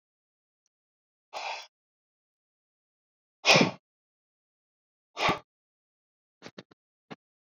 {"exhalation_length": "7.4 s", "exhalation_amplitude": 18335, "exhalation_signal_mean_std_ratio": 0.2, "survey_phase": "beta (2021-08-13 to 2022-03-07)", "age": "65+", "gender": "Male", "wearing_mask": "No", "symptom_none": true, "smoker_status": "Never smoked", "respiratory_condition_asthma": false, "respiratory_condition_other": false, "recruitment_source": "REACT", "submission_delay": "0 days", "covid_test_result": "Negative", "covid_test_method": "RT-qPCR"}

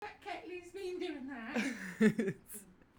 {"three_cough_length": "3.0 s", "three_cough_amplitude": 5268, "three_cough_signal_mean_std_ratio": 0.57, "survey_phase": "beta (2021-08-13 to 2022-03-07)", "age": "18-44", "gender": "Female", "wearing_mask": "No", "symptom_none": true, "smoker_status": "Never smoked", "respiratory_condition_asthma": false, "respiratory_condition_other": false, "recruitment_source": "REACT", "submission_delay": "1 day", "covid_test_result": "Negative", "covid_test_method": "RT-qPCR"}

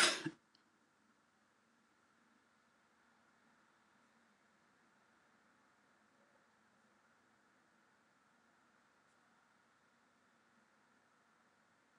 {"cough_length": "12.0 s", "cough_amplitude": 5195, "cough_signal_mean_std_ratio": 0.15, "survey_phase": "alpha (2021-03-01 to 2021-08-12)", "age": "65+", "gender": "Female", "wearing_mask": "No", "symptom_none": true, "smoker_status": "Never smoked", "respiratory_condition_asthma": false, "respiratory_condition_other": false, "recruitment_source": "REACT", "submission_delay": "2 days", "covid_test_result": "Negative", "covid_test_method": "RT-qPCR"}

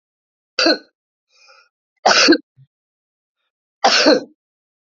{"three_cough_length": "4.9 s", "three_cough_amplitude": 30547, "three_cough_signal_mean_std_ratio": 0.34, "survey_phase": "beta (2021-08-13 to 2022-03-07)", "age": "65+", "gender": "Female", "wearing_mask": "No", "symptom_none": true, "smoker_status": "Current smoker (11 or more cigarettes per day)", "respiratory_condition_asthma": false, "respiratory_condition_other": false, "recruitment_source": "REACT", "submission_delay": "0 days", "covid_test_result": "Negative", "covid_test_method": "RT-qPCR", "influenza_a_test_result": "Negative", "influenza_b_test_result": "Negative"}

